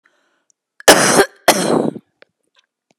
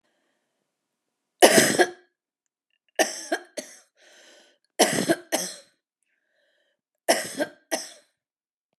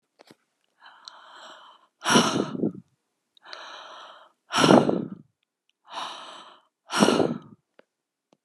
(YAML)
cough_length: 3.0 s
cough_amplitude: 32768
cough_signal_mean_std_ratio: 0.38
three_cough_length: 8.8 s
three_cough_amplitude: 32536
three_cough_signal_mean_std_ratio: 0.29
exhalation_length: 8.4 s
exhalation_amplitude: 30137
exhalation_signal_mean_std_ratio: 0.34
survey_phase: beta (2021-08-13 to 2022-03-07)
age: 45-64
gender: Female
wearing_mask: 'No'
symptom_none: true
smoker_status: Never smoked
respiratory_condition_asthma: false
respiratory_condition_other: false
recruitment_source: REACT
submission_delay: 5 days
covid_test_result: Negative
covid_test_method: RT-qPCR
influenza_a_test_result: Negative
influenza_b_test_result: Negative